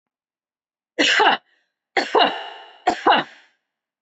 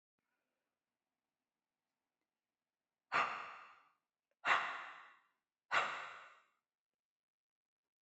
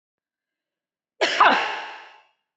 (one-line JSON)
{"three_cough_length": "4.0 s", "three_cough_amplitude": 22331, "three_cough_signal_mean_std_ratio": 0.41, "exhalation_length": "8.0 s", "exhalation_amplitude": 3134, "exhalation_signal_mean_std_ratio": 0.28, "cough_length": "2.6 s", "cough_amplitude": 20426, "cough_signal_mean_std_ratio": 0.36, "survey_phase": "beta (2021-08-13 to 2022-03-07)", "age": "45-64", "gender": "Female", "wearing_mask": "No", "symptom_none": true, "smoker_status": "Never smoked", "respiratory_condition_asthma": false, "respiratory_condition_other": false, "recruitment_source": "REACT", "submission_delay": "1 day", "covid_test_result": "Negative", "covid_test_method": "RT-qPCR"}